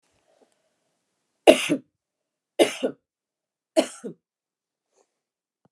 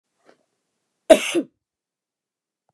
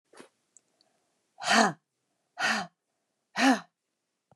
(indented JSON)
{
  "three_cough_length": "5.7 s",
  "three_cough_amplitude": 29204,
  "three_cough_signal_mean_std_ratio": 0.2,
  "cough_length": "2.7 s",
  "cough_amplitude": 29204,
  "cough_signal_mean_std_ratio": 0.19,
  "exhalation_length": "4.4 s",
  "exhalation_amplitude": 17508,
  "exhalation_signal_mean_std_ratio": 0.32,
  "survey_phase": "beta (2021-08-13 to 2022-03-07)",
  "age": "45-64",
  "gender": "Female",
  "wearing_mask": "No",
  "symptom_none": true,
  "smoker_status": "Never smoked",
  "respiratory_condition_asthma": false,
  "respiratory_condition_other": false,
  "recruitment_source": "REACT",
  "submission_delay": "4 days",
  "covid_test_result": "Negative",
  "covid_test_method": "RT-qPCR",
  "influenza_a_test_result": "Negative",
  "influenza_b_test_result": "Negative"
}